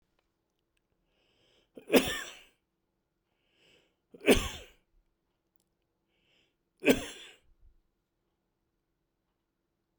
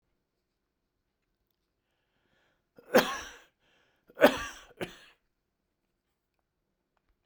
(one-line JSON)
{"three_cough_length": "10.0 s", "three_cough_amplitude": 14214, "three_cough_signal_mean_std_ratio": 0.19, "cough_length": "7.3 s", "cough_amplitude": 15643, "cough_signal_mean_std_ratio": 0.17, "survey_phase": "beta (2021-08-13 to 2022-03-07)", "age": "65+", "gender": "Male", "wearing_mask": "No", "symptom_cough_any": true, "symptom_runny_or_blocked_nose": true, "symptom_sore_throat": true, "symptom_fatigue": true, "symptom_headache": true, "symptom_onset": "3 days", "smoker_status": "Ex-smoker", "respiratory_condition_asthma": false, "respiratory_condition_other": false, "recruitment_source": "REACT", "submission_delay": "1 day", "covid_test_result": "Positive", "covid_test_method": "RT-qPCR", "covid_ct_value": 22.0, "covid_ct_gene": "E gene"}